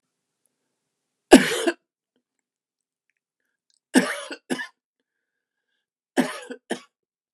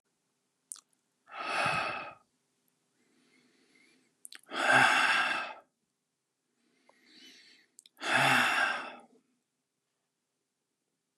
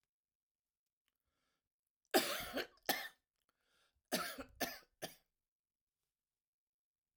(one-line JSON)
{"three_cough_length": "7.3 s", "three_cough_amplitude": 32767, "three_cough_signal_mean_std_ratio": 0.21, "exhalation_length": "11.2 s", "exhalation_amplitude": 9043, "exhalation_signal_mean_std_ratio": 0.37, "cough_length": "7.2 s", "cough_amplitude": 3896, "cough_signal_mean_std_ratio": 0.27, "survey_phase": "alpha (2021-03-01 to 2021-08-12)", "age": "65+", "gender": "Male", "wearing_mask": "No", "symptom_none": true, "smoker_status": "Never smoked", "respiratory_condition_asthma": false, "respiratory_condition_other": false, "recruitment_source": "REACT", "submission_delay": "2 days", "covid_test_result": "Negative", "covid_test_method": "RT-qPCR"}